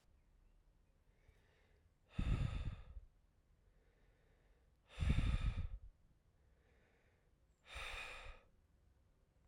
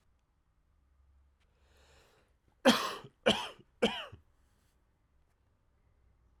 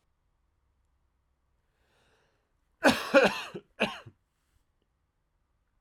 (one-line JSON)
{"exhalation_length": "9.5 s", "exhalation_amplitude": 2236, "exhalation_signal_mean_std_ratio": 0.37, "three_cough_length": "6.4 s", "three_cough_amplitude": 9483, "three_cough_signal_mean_std_ratio": 0.23, "cough_length": "5.8 s", "cough_amplitude": 15058, "cough_signal_mean_std_ratio": 0.23, "survey_phase": "alpha (2021-03-01 to 2021-08-12)", "age": "18-44", "gender": "Male", "wearing_mask": "No", "symptom_cough_any": true, "symptom_fatigue": true, "symptom_fever_high_temperature": true, "symptom_headache": true, "symptom_onset": "5 days", "smoker_status": "Never smoked", "respiratory_condition_asthma": false, "respiratory_condition_other": false, "recruitment_source": "Test and Trace", "submission_delay": "2 days", "covid_test_result": "Positive", "covid_test_method": "RT-qPCR"}